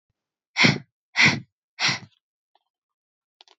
{"exhalation_length": "3.6 s", "exhalation_amplitude": 21964, "exhalation_signal_mean_std_ratio": 0.31, "survey_phase": "beta (2021-08-13 to 2022-03-07)", "age": "18-44", "gender": "Female", "wearing_mask": "No", "symptom_cough_any": true, "symptom_runny_or_blocked_nose": true, "smoker_status": "Never smoked", "respiratory_condition_asthma": true, "respiratory_condition_other": false, "recruitment_source": "REACT", "submission_delay": "1 day", "covid_test_result": "Negative", "covid_test_method": "RT-qPCR"}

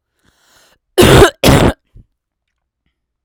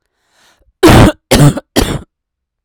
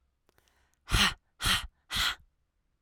{"cough_length": "3.2 s", "cough_amplitude": 32768, "cough_signal_mean_std_ratio": 0.37, "three_cough_length": "2.6 s", "three_cough_amplitude": 32768, "three_cough_signal_mean_std_ratio": 0.45, "exhalation_length": "2.8 s", "exhalation_amplitude": 9440, "exhalation_signal_mean_std_ratio": 0.39, "survey_phase": "alpha (2021-03-01 to 2021-08-12)", "age": "18-44", "gender": "Female", "wearing_mask": "No", "symptom_cough_any": true, "symptom_diarrhoea": true, "symptom_fatigue": true, "symptom_headache": true, "symptom_change_to_sense_of_smell_or_taste": true, "symptom_onset": "4 days", "smoker_status": "Current smoker (1 to 10 cigarettes per day)", "respiratory_condition_asthma": true, "respiratory_condition_other": false, "recruitment_source": "Test and Trace", "submission_delay": "2 days", "covid_test_result": "Positive", "covid_test_method": "RT-qPCR"}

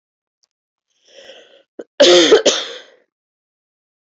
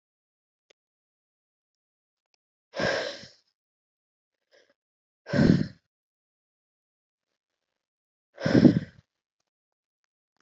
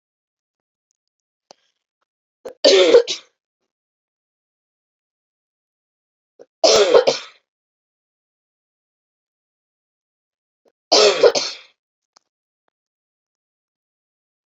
{"cough_length": "4.1 s", "cough_amplitude": 30680, "cough_signal_mean_std_ratio": 0.31, "exhalation_length": "10.4 s", "exhalation_amplitude": 24236, "exhalation_signal_mean_std_ratio": 0.21, "three_cough_length": "14.5 s", "three_cough_amplitude": 32014, "three_cough_signal_mean_std_ratio": 0.24, "survey_phase": "beta (2021-08-13 to 2022-03-07)", "age": "18-44", "gender": "Female", "wearing_mask": "No", "symptom_new_continuous_cough": true, "symptom_runny_or_blocked_nose": true, "symptom_sore_throat": true, "symptom_abdominal_pain": true, "symptom_diarrhoea": true, "symptom_fatigue": true, "symptom_headache": true, "symptom_change_to_sense_of_smell_or_taste": true, "symptom_other": true, "smoker_status": "Never smoked", "respiratory_condition_asthma": false, "respiratory_condition_other": false, "recruitment_source": "Test and Trace", "submission_delay": "2 days", "covid_test_result": "Positive", "covid_test_method": "LFT"}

